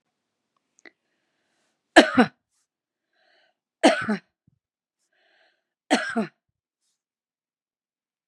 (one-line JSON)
{"three_cough_length": "8.3 s", "three_cough_amplitude": 32767, "three_cough_signal_mean_std_ratio": 0.2, "survey_phase": "beta (2021-08-13 to 2022-03-07)", "age": "45-64", "gender": "Female", "wearing_mask": "No", "symptom_cough_any": true, "symptom_runny_or_blocked_nose": true, "symptom_fatigue": true, "smoker_status": "Ex-smoker", "respiratory_condition_asthma": false, "respiratory_condition_other": false, "recruitment_source": "Test and Trace", "submission_delay": "2 days", "covid_test_result": "Positive", "covid_test_method": "RT-qPCR", "covid_ct_value": 21.0, "covid_ct_gene": "N gene"}